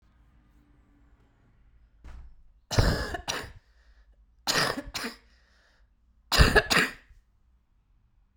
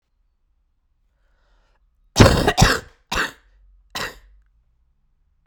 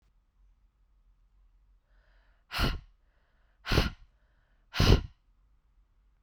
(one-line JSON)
{"three_cough_length": "8.4 s", "three_cough_amplitude": 18538, "three_cough_signal_mean_std_ratio": 0.32, "cough_length": "5.5 s", "cough_amplitude": 32768, "cough_signal_mean_std_ratio": 0.27, "exhalation_length": "6.2 s", "exhalation_amplitude": 11759, "exhalation_signal_mean_std_ratio": 0.26, "survey_phase": "beta (2021-08-13 to 2022-03-07)", "age": "18-44", "gender": "Female", "wearing_mask": "No", "symptom_cough_any": true, "symptom_new_continuous_cough": true, "symptom_runny_or_blocked_nose": true, "symptom_fatigue": true, "symptom_change_to_sense_of_smell_or_taste": true, "symptom_onset": "6 days", "smoker_status": "Never smoked", "respiratory_condition_asthma": false, "respiratory_condition_other": false, "recruitment_source": "Test and Trace", "submission_delay": "1 day", "covid_test_result": "Positive", "covid_test_method": "RT-qPCR", "covid_ct_value": 21.0, "covid_ct_gene": "ORF1ab gene", "covid_ct_mean": 21.2, "covid_viral_load": "110000 copies/ml", "covid_viral_load_category": "Low viral load (10K-1M copies/ml)"}